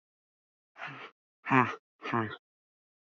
{"exhalation_length": "3.2 s", "exhalation_amplitude": 11275, "exhalation_signal_mean_std_ratio": 0.3, "survey_phase": "alpha (2021-03-01 to 2021-08-12)", "age": "45-64", "gender": "Female", "wearing_mask": "No", "symptom_none": true, "smoker_status": "Ex-smoker", "respiratory_condition_asthma": false, "respiratory_condition_other": false, "recruitment_source": "REACT", "submission_delay": "2 days", "covid_test_result": "Negative", "covid_test_method": "RT-qPCR"}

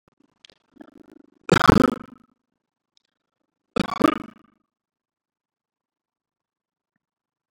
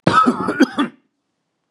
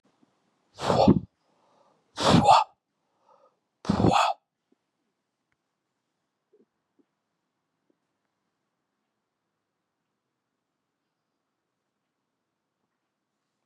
{"three_cough_length": "7.5 s", "three_cough_amplitude": 32768, "three_cough_signal_mean_std_ratio": 0.18, "cough_length": "1.7 s", "cough_amplitude": 32751, "cough_signal_mean_std_ratio": 0.49, "exhalation_length": "13.7 s", "exhalation_amplitude": 18151, "exhalation_signal_mean_std_ratio": 0.23, "survey_phase": "beta (2021-08-13 to 2022-03-07)", "age": "45-64", "gender": "Male", "wearing_mask": "No", "symptom_none": true, "smoker_status": "Ex-smoker", "respiratory_condition_asthma": false, "respiratory_condition_other": true, "recruitment_source": "REACT", "submission_delay": "0 days", "covid_test_result": "Negative", "covid_test_method": "RT-qPCR", "influenza_a_test_result": "Negative", "influenza_b_test_result": "Negative"}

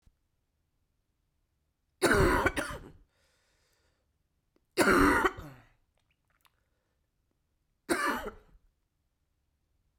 {"three_cough_length": "10.0 s", "three_cough_amplitude": 9992, "three_cough_signal_mean_std_ratio": 0.31, "survey_phase": "beta (2021-08-13 to 2022-03-07)", "age": "18-44", "gender": "Female", "wearing_mask": "No", "symptom_runny_or_blocked_nose": true, "symptom_shortness_of_breath": true, "symptom_fatigue": true, "symptom_headache": true, "symptom_change_to_sense_of_smell_or_taste": true, "symptom_loss_of_taste": true, "symptom_onset": "6 days", "smoker_status": "Never smoked", "respiratory_condition_asthma": false, "respiratory_condition_other": false, "recruitment_source": "Test and Trace", "submission_delay": "2 days", "covid_test_result": "Positive", "covid_test_method": "RT-qPCR", "covid_ct_value": 15.4, "covid_ct_gene": "ORF1ab gene", "covid_ct_mean": 16.5, "covid_viral_load": "3800000 copies/ml", "covid_viral_load_category": "High viral load (>1M copies/ml)"}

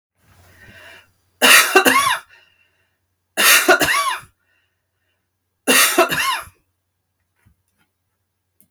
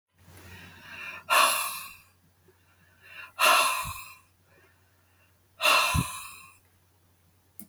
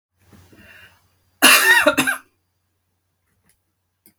{"three_cough_length": "8.7 s", "three_cough_amplitude": 32768, "three_cough_signal_mean_std_ratio": 0.39, "exhalation_length": "7.7 s", "exhalation_amplitude": 12629, "exhalation_signal_mean_std_ratio": 0.39, "cough_length": "4.2 s", "cough_amplitude": 32768, "cough_signal_mean_std_ratio": 0.32, "survey_phase": "beta (2021-08-13 to 2022-03-07)", "age": "65+", "gender": "Female", "wearing_mask": "No", "symptom_runny_or_blocked_nose": true, "symptom_onset": "12 days", "smoker_status": "Ex-smoker", "respiratory_condition_asthma": false, "respiratory_condition_other": false, "recruitment_source": "REACT", "submission_delay": "3 days", "covid_test_result": "Negative", "covid_test_method": "RT-qPCR", "influenza_a_test_result": "Negative", "influenza_b_test_result": "Negative"}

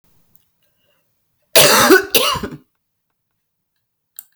{"cough_length": "4.4 s", "cough_amplitude": 32768, "cough_signal_mean_std_ratio": 0.33, "survey_phase": "beta (2021-08-13 to 2022-03-07)", "age": "65+", "gender": "Female", "wearing_mask": "No", "symptom_cough_any": true, "symptom_fatigue": true, "symptom_fever_high_temperature": true, "symptom_headache": true, "symptom_change_to_sense_of_smell_or_taste": true, "symptom_loss_of_taste": true, "symptom_other": true, "symptom_onset": "9 days", "smoker_status": "Ex-smoker", "respiratory_condition_asthma": false, "respiratory_condition_other": false, "recruitment_source": "REACT", "submission_delay": "4 days", "covid_test_result": "Positive", "covid_test_method": "RT-qPCR", "covid_ct_value": 24.5, "covid_ct_gene": "E gene", "influenza_a_test_result": "Negative", "influenza_b_test_result": "Negative"}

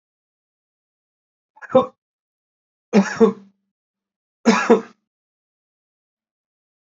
{"three_cough_length": "7.0 s", "three_cough_amplitude": 26582, "three_cough_signal_mean_std_ratio": 0.24, "survey_phase": "beta (2021-08-13 to 2022-03-07)", "age": "45-64", "gender": "Male", "wearing_mask": "No", "symptom_runny_or_blocked_nose": true, "symptom_onset": "13 days", "smoker_status": "Never smoked", "respiratory_condition_asthma": false, "respiratory_condition_other": false, "recruitment_source": "REACT", "submission_delay": "17 days", "covid_test_result": "Negative", "covid_test_method": "RT-qPCR", "influenza_a_test_result": "Negative", "influenza_b_test_result": "Negative"}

